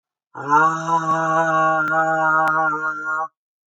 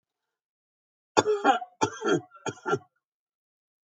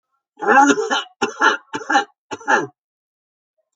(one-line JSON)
{"exhalation_length": "3.7 s", "exhalation_amplitude": 20762, "exhalation_signal_mean_std_ratio": 0.92, "cough_length": "3.8 s", "cough_amplitude": 25346, "cough_signal_mean_std_ratio": 0.35, "three_cough_length": "3.8 s", "three_cough_amplitude": 28444, "three_cough_signal_mean_std_ratio": 0.45, "survey_phase": "alpha (2021-03-01 to 2021-08-12)", "age": "65+", "gender": "Female", "wearing_mask": "No", "symptom_none": true, "smoker_status": "Ex-smoker", "respiratory_condition_asthma": false, "respiratory_condition_other": false, "recruitment_source": "REACT", "submission_delay": "2 days", "covid_test_result": "Negative", "covid_test_method": "RT-qPCR"}